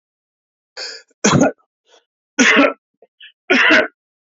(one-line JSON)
{"three_cough_length": "4.4 s", "three_cough_amplitude": 29026, "three_cough_signal_mean_std_ratio": 0.41, "survey_phase": "alpha (2021-03-01 to 2021-08-12)", "age": "45-64", "gender": "Male", "wearing_mask": "No", "symptom_none": true, "smoker_status": "Ex-smoker", "respiratory_condition_asthma": false, "respiratory_condition_other": false, "recruitment_source": "REACT", "submission_delay": "2 days", "covid_test_result": "Negative", "covid_test_method": "RT-qPCR"}